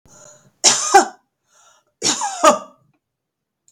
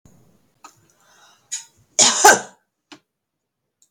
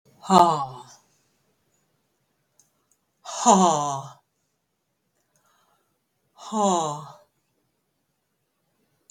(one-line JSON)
{"three_cough_length": "3.7 s", "three_cough_amplitude": 32768, "three_cough_signal_mean_std_ratio": 0.34, "cough_length": "3.9 s", "cough_amplitude": 32767, "cough_signal_mean_std_ratio": 0.25, "exhalation_length": "9.1 s", "exhalation_amplitude": 29145, "exhalation_signal_mean_std_ratio": 0.29, "survey_phase": "beta (2021-08-13 to 2022-03-07)", "age": "65+", "gender": "Female", "wearing_mask": "No", "symptom_none": true, "smoker_status": "Never smoked", "respiratory_condition_asthma": false, "respiratory_condition_other": false, "recruitment_source": "REACT", "submission_delay": "2 days", "covid_test_result": "Negative", "covid_test_method": "RT-qPCR"}